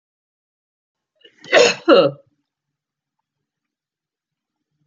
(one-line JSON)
{"cough_length": "4.9 s", "cough_amplitude": 28635, "cough_signal_mean_std_ratio": 0.24, "survey_phase": "beta (2021-08-13 to 2022-03-07)", "age": "65+", "gender": "Female", "wearing_mask": "No", "symptom_none": true, "smoker_status": "Never smoked", "respiratory_condition_asthma": false, "respiratory_condition_other": false, "recruitment_source": "REACT", "submission_delay": "2 days", "covid_test_result": "Negative", "covid_test_method": "RT-qPCR"}